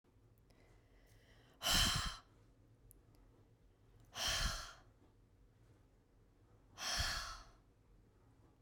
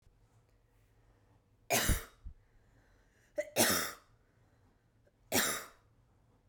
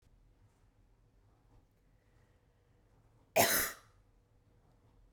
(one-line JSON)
{"exhalation_length": "8.6 s", "exhalation_amplitude": 3224, "exhalation_signal_mean_std_ratio": 0.39, "three_cough_length": "6.5 s", "three_cough_amplitude": 8305, "three_cough_signal_mean_std_ratio": 0.33, "cough_length": "5.1 s", "cough_amplitude": 7100, "cough_signal_mean_std_ratio": 0.23, "survey_phase": "beta (2021-08-13 to 2022-03-07)", "age": "18-44", "gender": "Female", "wearing_mask": "No", "symptom_runny_or_blocked_nose": true, "symptom_onset": "8 days", "smoker_status": "Never smoked", "respiratory_condition_asthma": false, "respiratory_condition_other": false, "recruitment_source": "REACT", "submission_delay": "1 day", "covid_test_result": "Negative", "covid_test_method": "RT-qPCR", "influenza_a_test_result": "Unknown/Void", "influenza_b_test_result": "Unknown/Void"}